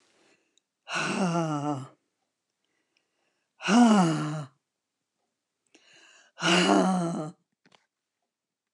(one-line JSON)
{"exhalation_length": "8.7 s", "exhalation_amplitude": 12722, "exhalation_signal_mean_std_ratio": 0.42, "survey_phase": "alpha (2021-03-01 to 2021-08-12)", "age": "65+", "gender": "Female", "wearing_mask": "No", "symptom_none": true, "smoker_status": "Never smoked", "respiratory_condition_asthma": false, "respiratory_condition_other": false, "recruitment_source": "REACT", "submission_delay": "1 day", "covid_test_result": "Negative", "covid_test_method": "RT-qPCR"}